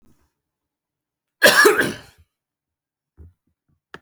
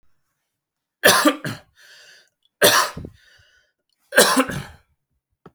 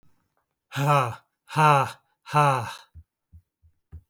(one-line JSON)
{"cough_length": "4.0 s", "cough_amplitude": 32768, "cough_signal_mean_std_ratio": 0.27, "three_cough_length": "5.5 s", "three_cough_amplitude": 32768, "three_cough_signal_mean_std_ratio": 0.34, "exhalation_length": "4.1 s", "exhalation_amplitude": 19695, "exhalation_signal_mean_std_ratio": 0.4, "survey_phase": "beta (2021-08-13 to 2022-03-07)", "age": "45-64", "gender": "Male", "wearing_mask": "No", "symptom_cough_any": true, "symptom_runny_or_blocked_nose": true, "symptom_fatigue": true, "symptom_headache": true, "symptom_onset": "3 days", "smoker_status": "Never smoked", "respiratory_condition_asthma": false, "respiratory_condition_other": false, "recruitment_source": "Test and Trace", "submission_delay": "1 day", "covid_test_result": "Positive", "covid_test_method": "RT-qPCR", "covid_ct_value": 17.4, "covid_ct_gene": "ORF1ab gene"}